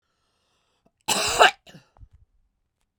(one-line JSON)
{"cough_length": "3.0 s", "cough_amplitude": 32767, "cough_signal_mean_std_ratio": 0.26, "survey_phase": "beta (2021-08-13 to 2022-03-07)", "age": "45-64", "gender": "Female", "wearing_mask": "No", "symptom_none": true, "smoker_status": "Ex-smoker", "respiratory_condition_asthma": false, "respiratory_condition_other": false, "recruitment_source": "REACT", "submission_delay": "1 day", "covid_test_result": "Negative", "covid_test_method": "RT-qPCR"}